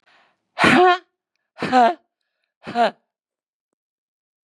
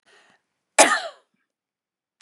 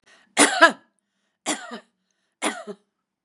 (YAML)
exhalation_length: 4.4 s
exhalation_amplitude: 28863
exhalation_signal_mean_std_ratio: 0.34
cough_length: 2.2 s
cough_amplitude: 32768
cough_signal_mean_std_ratio: 0.23
three_cough_length: 3.2 s
three_cough_amplitude: 32767
three_cough_signal_mean_std_ratio: 0.28
survey_phase: beta (2021-08-13 to 2022-03-07)
age: 65+
gender: Female
wearing_mask: 'No'
symptom_none: true
smoker_status: Never smoked
respiratory_condition_asthma: false
respiratory_condition_other: false
recruitment_source: REACT
submission_delay: 8 days
covid_test_result: Negative
covid_test_method: RT-qPCR
influenza_a_test_result: Negative
influenza_b_test_result: Negative